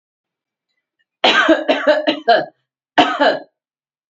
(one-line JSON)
{"cough_length": "4.1 s", "cough_amplitude": 32351, "cough_signal_mean_std_ratio": 0.46, "survey_phase": "beta (2021-08-13 to 2022-03-07)", "age": "18-44", "gender": "Female", "wearing_mask": "No", "symptom_runny_or_blocked_nose": true, "symptom_shortness_of_breath": true, "symptom_sore_throat": true, "symptom_fatigue": true, "symptom_headache": true, "smoker_status": "Ex-smoker", "respiratory_condition_asthma": true, "respiratory_condition_other": false, "recruitment_source": "Test and Trace", "submission_delay": "2 days", "covid_test_result": "Positive", "covid_test_method": "RT-qPCR"}